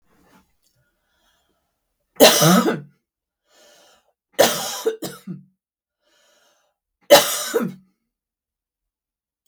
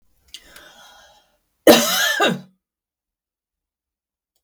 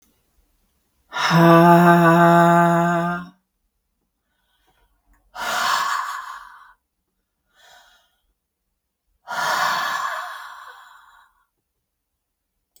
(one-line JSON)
{"three_cough_length": "9.5 s", "three_cough_amplitude": 32768, "three_cough_signal_mean_std_ratio": 0.28, "cough_length": "4.4 s", "cough_amplitude": 32768, "cough_signal_mean_std_ratio": 0.28, "exhalation_length": "12.8 s", "exhalation_amplitude": 32766, "exhalation_signal_mean_std_ratio": 0.43, "survey_phase": "beta (2021-08-13 to 2022-03-07)", "age": "45-64", "gender": "Female", "wearing_mask": "No", "symptom_none": true, "smoker_status": "Ex-smoker", "respiratory_condition_asthma": false, "respiratory_condition_other": false, "recruitment_source": "REACT", "submission_delay": "1 day", "covid_test_result": "Negative", "covid_test_method": "RT-qPCR", "influenza_a_test_result": "Negative", "influenza_b_test_result": "Negative"}